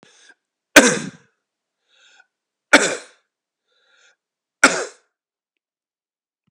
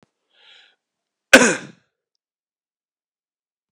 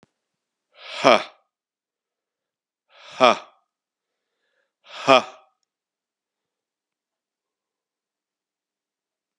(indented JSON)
{
  "three_cough_length": "6.5 s",
  "three_cough_amplitude": 32768,
  "three_cough_signal_mean_std_ratio": 0.21,
  "cough_length": "3.7 s",
  "cough_amplitude": 32768,
  "cough_signal_mean_std_ratio": 0.17,
  "exhalation_length": "9.4 s",
  "exhalation_amplitude": 32699,
  "exhalation_signal_mean_std_ratio": 0.17,
  "survey_phase": "beta (2021-08-13 to 2022-03-07)",
  "age": "45-64",
  "gender": "Male",
  "wearing_mask": "No",
  "symptom_cough_any": true,
  "symptom_runny_or_blocked_nose": true,
  "symptom_sore_throat": true,
  "symptom_headache": true,
  "smoker_status": "Never smoked",
  "respiratory_condition_asthma": false,
  "respiratory_condition_other": false,
  "recruitment_source": "Test and Trace",
  "submission_delay": "2 days",
  "covid_test_result": "Positive",
  "covid_test_method": "RT-qPCR",
  "covid_ct_value": 20.4,
  "covid_ct_gene": "ORF1ab gene",
  "covid_ct_mean": 21.1,
  "covid_viral_load": "120000 copies/ml",
  "covid_viral_load_category": "Low viral load (10K-1M copies/ml)"
}